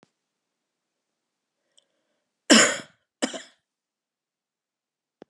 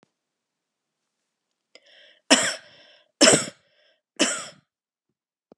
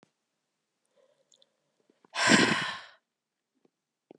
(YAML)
cough_length: 5.3 s
cough_amplitude: 26926
cough_signal_mean_std_ratio: 0.18
three_cough_length: 5.6 s
three_cough_amplitude: 31326
three_cough_signal_mean_std_ratio: 0.25
exhalation_length: 4.2 s
exhalation_amplitude: 14931
exhalation_signal_mean_std_ratio: 0.28
survey_phase: beta (2021-08-13 to 2022-03-07)
age: 45-64
gender: Female
wearing_mask: 'No'
symptom_cough_any: true
symptom_runny_or_blocked_nose: true
symptom_sore_throat: true
symptom_fatigue: true
symptom_headache: true
symptom_other: true
symptom_onset: 3 days
smoker_status: Ex-smoker
respiratory_condition_asthma: false
respiratory_condition_other: false
recruitment_source: Test and Trace
submission_delay: 2 days
covid_test_result: Positive
covid_test_method: RT-qPCR
covid_ct_value: 16.6
covid_ct_gene: ORF1ab gene
covid_ct_mean: 16.9
covid_viral_load: 2900000 copies/ml
covid_viral_load_category: High viral load (>1M copies/ml)